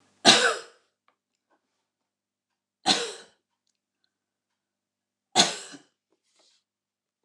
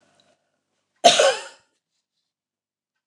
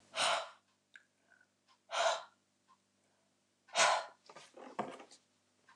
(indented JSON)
{
  "three_cough_length": "7.2 s",
  "three_cough_amplitude": 28659,
  "three_cough_signal_mean_std_ratio": 0.22,
  "cough_length": "3.1 s",
  "cough_amplitude": 29185,
  "cough_signal_mean_std_ratio": 0.24,
  "exhalation_length": "5.8 s",
  "exhalation_amplitude": 5203,
  "exhalation_signal_mean_std_ratio": 0.34,
  "survey_phase": "alpha (2021-03-01 to 2021-08-12)",
  "age": "45-64",
  "gender": "Female",
  "wearing_mask": "No",
  "symptom_none": true,
  "smoker_status": "Ex-smoker",
  "respiratory_condition_asthma": false,
  "respiratory_condition_other": false,
  "recruitment_source": "REACT",
  "submission_delay": "1 day",
  "covid_test_result": "Negative",
  "covid_test_method": "RT-qPCR"
}